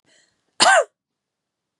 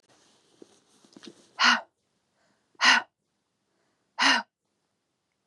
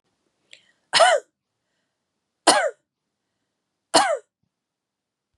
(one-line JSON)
{"cough_length": "1.8 s", "cough_amplitude": 28836, "cough_signal_mean_std_ratio": 0.29, "exhalation_length": "5.5 s", "exhalation_amplitude": 15504, "exhalation_signal_mean_std_ratio": 0.27, "three_cough_length": "5.4 s", "three_cough_amplitude": 32767, "three_cough_signal_mean_std_ratio": 0.28, "survey_phase": "beta (2021-08-13 to 2022-03-07)", "age": "18-44", "gender": "Female", "wearing_mask": "No", "symptom_fatigue": true, "symptom_other": true, "symptom_onset": "8 days", "smoker_status": "Never smoked", "respiratory_condition_asthma": false, "respiratory_condition_other": false, "recruitment_source": "REACT", "submission_delay": "3 days", "covid_test_result": "Positive", "covid_test_method": "RT-qPCR", "covid_ct_value": 27.0, "covid_ct_gene": "E gene", "influenza_a_test_result": "Negative", "influenza_b_test_result": "Negative"}